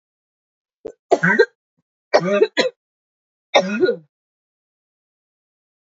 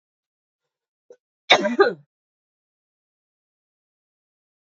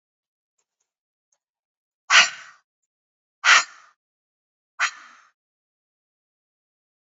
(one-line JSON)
{"three_cough_length": "6.0 s", "three_cough_amplitude": 29277, "three_cough_signal_mean_std_ratio": 0.33, "cough_length": "4.8 s", "cough_amplitude": 28483, "cough_signal_mean_std_ratio": 0.19, "exhalation_length": "7.2 s", "exhalation_amplitude": 27033, "exhalation_signal_mean_std_ratio": 0.19, "survey_phase": "beta (2021-08-13 to 2022-03-07)", "age": "18-44", "gender": "Female", "wearing_mask": "No", "symptom_cough_any": true, "symptom_runny_or_blocked_nose": true, "symptom_change_to_sense_of_smell_or_taste": true, "smoker_status": "Current smoker (e-cigarettes or vapes only)", "respiratory_condition_asthma": false, "respiratory_condition_other": false, "recruitment_source": "Test and Trace", "submission_delay": "1 day", "covid_test_result": "Positive", "covid_test_method": "RT-qPCR", "covid_ct_value": 16.9, "covid_ct_gene": "N gene"}